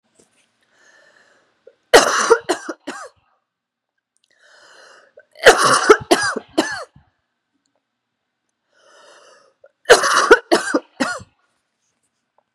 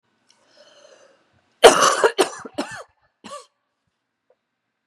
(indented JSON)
{
  "three_cough_length": "12.5 s",
  "three_cough_amplitude": 32768,
  "three_cough_signal_mean_std_ratio": 0.3,
  "cough_length": "4.9 s",
  "cough_amplitude": 32768,
  "cough_signal_mean_std_ratio": 0.25,
  "survey_phase": "beta (2021-08-13 to 2022-03-07)",
  "age": "45-64",
  "gender": "Female",
  "wearing_mask": "No",
  "symptom_cough_any": true,
  "symptom_runny_or_blocked_nose": true,
  "symptom_shortness_of_breath": true,
  "symptom_sore_throat": true,
  "symptom_abdominal_pain": true,
  "symptom_fatigue": true,
  "symptom_headache": true,
  "symptom_change_to_sense_of_smell_or_taste": true,
  "symptom_onset": "8 days",
  "smoker_status": "Never smoked",
  "respiratory_condition_asthma": false,
  "respiratory_condition_other": false,
  "recruitment_source": "Test and Trace",
  "submission_delay": "1 day",
  "covid_test_result": "Positive",
  "covid_test_method": "ePCR"
}